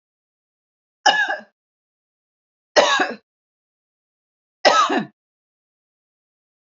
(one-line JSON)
{"three_cough_length": "6.7 s", "three_cough_amplitude": 29607, "three_cough_signal_mean_std_ratio": 0.3, "survey_phase": "beta (2021-08-13 to 2022-03-07)", "age": "45-64", "gender": "Female", "wearing_mask": "No", "symptom_none": true, "smoker_status": "Never smoked", "respiratory_condition_asthma": false, "respiratory_condition_other": false, "recruitment_source": "REACT", "submission_delay": "1 day", "covid_test_result": "Negative", "covid_test_method": "RT-qPCR", "influenza_a_test_result": "Negative", "influenza_b_test_result": "Negative"}